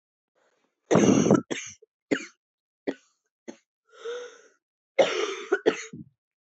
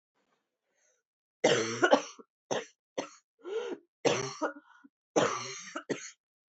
{"cough_length": "6.6 s", "cough_amplitude": 16751, "cough_signal_mean_std_ratio": 0.34, "three_cough_length": "6.5 s", "three_cough_amplitude": 12509, "three_cough_signal_mean_std_ratio": 0.39, "survey_phase": "beta (2021-08-13 to 2022-03-07)", "age": "18-44", "gender": "Female", "wearing_mask": "No", "symptom_cough_any": true, "symptom_new_continuous_cough": true, "symptom_runny_or_blocked_nose": true, "symptom_shortness_of_breath": true, "symptom_sore_throat": true, "symptom_fatigue": true, "symptom_headache": true, "symptom_onset": "2 days", "smoker_status": "Ex-smoker", "respiratory_condition_asthma": false, "respiratory_condition_other": false, "recruitment_source": "Test and Trace", "submission_delay": "1 day", "covid_test_result": "Positive", "covid_test_method": "RT-qPCR", "covid_ct_value": 19.4, "covid_ct_gene": "ORF1ab gene", "covid_ct_mean": 19.7, "covid_viral_load": "340000 copies/ml", "covid_viral_load_category": "Low viral load (10K-1M copies/ml)"}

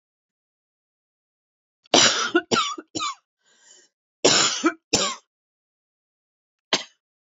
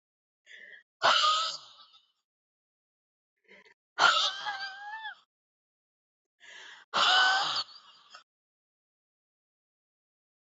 {"cough_length": "7.3 s", "cough_amplitude": 29611, "cough_signal_mean_std_ratio": 0.34, "exhalation_length": "10.4 s", "exhalation_amplitude": 11782, "exhalation_signal_mean_std_ratio": 0.35, "survey_phase": "alpha (2021-03-01 to 2021-08-12)", "age": "45-64", "gender": "Female", "wearing_mask": "No", "symptom_cough_any": true, "symptom_change_to_sense_of_smell_or_taste": true, "symptom_loss_of_taste": true, "smoker_status": "Ex-smoker", "respiratory_condition_asthma": false, "respiratory_condition_other": false, "recruitment_source": "Test and Trace", "submission_delay": "2 days", "covid_test_result": "Positive", "covid_test_method": "RT-qPCR", "covid_ct_value": 15.8, "covid_ct_gene": "N gene", "covid_ct_mean": 16.4, "covid_viral_load": "4000000 copies/ml", "covid_viral_load_category": "High viral load (>1M copies/ml)"}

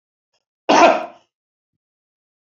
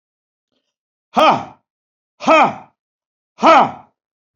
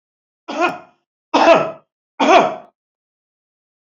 {"cough_length": "2.6 s", "cough_amplitude": 28289, "cough_signal_mean_std_ratio": 0.28, "exhalation_length": "4.4 s", "exhalation_amplitude": 29795, "exhalation_signal_mean_std_ratio": 0.34, "three_cough_length": "3.8 s", "three_cough_amplitude": 29412, "three_cough_signal_mean_std_ratio": 0.37, "survey_phase": "beta (2021-08-13 to 2022-03-07)", "age": "45-64", "gender": "Male", "wearing_mask": "No", "symptom_cough_any": true, "symptom_onset": "12 days", "smoker_status": "Never smoked", "respiratory_condition_asthma": false, "respiratory_condition_other": false, "recruitment_source": "REACT", "submission_delay": "1 day", "covid_test_result": "Negative", "covid_test_method": "RT-qPCR", "influenza_a_test_result": "Unknown/Void", "influenza_b_test_result": "Unknown/Void"}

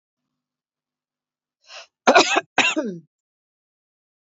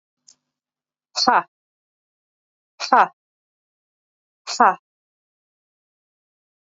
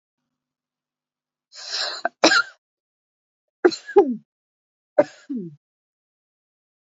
{"cough_length": "4.4 s", "cough_amplitude": 27660, "cough_signal_mean_std_ratio": 0.27, "exhalation_length": "6.7 s", "exhalation_amplitude": 31432, "exhalation_signal_mean_std_ratio": 0.2, "three_cough_length": "6.8 s", "three_cough_amplitude": 27364, "three_cough_signal_mean_std_ratio": 0.26, "survey_phase": "beta (2021-08-13 to 2022-03-07)", "age": "45-64", "gender": "Female", "wearing_mask": "No", "symptom_sore_throat": true, "symptom_fatigue": true, "symptom_onset": "13 days", "smoker_status": "Never smoked", "respiratory_condition_asthma": false, "respiratory_condition_other": false, "recruitment_source": "REACT", "submission_delay": "4 days", "covid_test_result": "Negative", "covid_test_method": "RT-qPCR"}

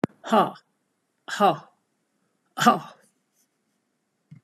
{"exhalation_length": "4.4 s", "exhalation_amplitude": 28011, "exhalation_signal_mean_std_ratio": 0.28, "survey_phase": "beta (2021-08-13 to 2022-03-07)", "age": "65+", "gender": "Female", "wearing_mask": "No", "symptom_none": true, "smoker_status": "Never smoked", "respiratory_condition_asthma": false, "respiratory_condition_other": false, "recruitment_source": "REACT", "submission_delay": "4 days", "covid_test_result": "Negative", "covid_test_method": "RT-qPCR"}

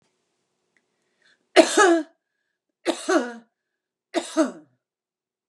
{"three_cough_length": "5.5 s", "three_cough_amplitude": 31304, "three_cough_signal_mean_std_ratio": 0.3, "survey_phase": "beta (2021-08-13 to 2022-03-07)", "age": "65+", "gender": "Female", "wearing_mask": "No", "symptom_none": true, "smoker_status": "Ex-smoker", "respiratory_condition_asthma": false, "respiratory_condition_other": false, "recruitment_source": "REACT", "submission_delay": "1 day", "covid_test_result": "Negative", "covid_test_method": "RT-qPCR", "influenza_a_test_result": "Negative", "influenza_b_test_result": "Negative"}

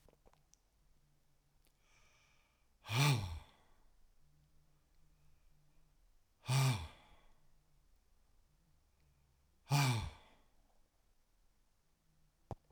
{"exhalation_length": "12.7 s", "exhalation_amplitude": 3024, "exhalation_signal_mean_std_ratio": 0.29, "survey_phase": "alpha (2021-03-01 to 2021-08-12)", "age": "65+", "gender": "Male", "wearing_mask": "No", "symptom_none": true, "smoker_status": "Never smoked", "respiratory_condition_asthma": false, "respiratory_condition_other": false, "recruitment_source": "REACT", "submission_delay": "3 days", "covid_test_result": "Negative", "covid_test_method": "RT-qPCR"}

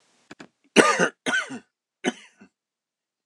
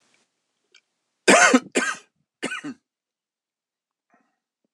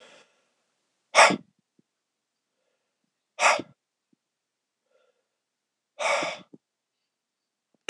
{"three_cough_length": "3.3 s", "three_cough_amplitude": 26028, "three_cough_signal_mean_std_ratio": 0.31, "cough_length": "4.7 s", "cough_amplitude": 26028, "cough_signal_mean_std_ratio": 0.26, "exhalation_length": "7.9 s", "exhalation_amplitude": 22923, "exhalation_signal_mean_std_ratio": 0.21, "survey_phase": "beta (2021-08-13 to 2022-03-07)", "age": "18-44", "gender": "Male", "wearing_mask": "No", "symptom_cough_any": true, "symptom_new_continuous_cough": true, "symptom_runny_or_blocked_nose": true, "symptom_sore_throat": true, "symptom_abdominal_pain": true, "symptom_fatigue": true, "symptom_fever_high_temperature": true, "symptom_headache": true, "symptom_onset": "2 days", "smoker_status": "Never smoked", "respiratory_condition_asthma": false, "respiratory_condition_other": false, "recruitment_source": "Test and Trace", "submission_delay": "1 day", "covid_test_result": "Positive", "covid_test_method": "RT-qPCR", "covid_ct_value": 26.7, "covid_ct_gene": "ORF1ab gene", "covid_ct_mean": 27.4, "covid_viral_load": "1000 copies/ml", "covid_viral_load_category": "Minimal viral load (< 10K copies/ml)"}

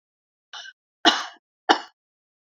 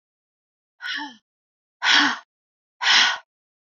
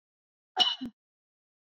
{"three_cough_length": "2.6 s", "three_cough_amplitude": 28627, "three_cough_signal_mean_std_ratio": 0.24, "exhalation_length": "3.7 s", "exhalation_amplitude": 22275, "exhalation_signal_mean_std_ratio": 0.37, "cough_length": "1.6 s", "cough_amplitude": 10740, "cough_signal_mean_std_ratio": 0.28, "survey_phase": "alpha (2021-03-01 to 2021-08-12)", "age": "45-64", "gender": "Female", "wearing_mask": "No", "symptom_none": true, "smoker_status": "Never smoked", "respiratory_condition_asthma": false, "respiratory_condition_other": false, "recruitment_source": "REACT", "submission_delay": "1 day", "covid_test_result": "Negative", "covid_test_method": "RT-qPCR"}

